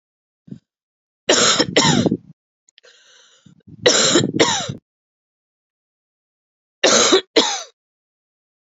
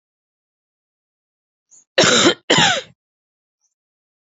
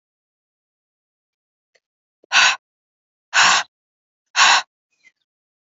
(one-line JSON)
{"three_cough_length": "8.7 s", "three_cough_amplitude": 32628, "three_cough_signal_mean_std_ratio": 0.4, "cough_length": "4.3 s", "cough_amplitude": 29208, "cough_signal_mean_std_ratio": 0.32, "exhalation_length": "5.6 s", "exhalation_amplitude": 28193, "exhalation_signal_mean_std_ratio": 0.29, "survey_phase": "beta (2021-08-13 to 2022-03-07)", "age": "18-44", "gender": "Female", "wearing_mask": "No", "symptom_cough_any": true, "symptom_runny_or_blocked_nose": true, "symptom_fatigue": true, "symptom_headache": true, "smoker_status": "Never smoked", "respiratory_condition_asthma": false, "respiratory_condition_other": false, "recruitment_source": "Test and Trace", "submission_delay": "2 days", "covid_test_result": "Positive", "covid_test_method": "RT-qPCR", "covid_ct_value": 17.0, "covid_ct_gene": "ORF1ab gene", "covid_ct_mean": 17.1, "covid_viral_load": "2400000 copies/ml", "covid_viral_load_category": "High viral load (>1M copies/ml)"}